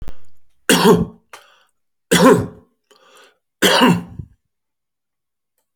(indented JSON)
{
  "three_cough_length": "5.8 s",
  "three_cough_amplitude": 32768,
  "three_cough_signal_mean_std_ratio": 0.4,
  "survey_phase": "alpha (2021-03-01 to 2021-08-12)",
  "age": "45-64",
  "gender": "Male",
  "wearing_mask": "No",
  "symptom_none": true,
  "smoker_status": "Current smoker (11 or more cigarettes per day)",
  "respiratory_condition_asthma": false,
  "respiratory_condition_other": false,
  "recruitment_source": "REACT",
  "submission_delay": "3 days",
  "covid_test_result": "Negative",
  "covid_test_method": "RT-qPCR"
}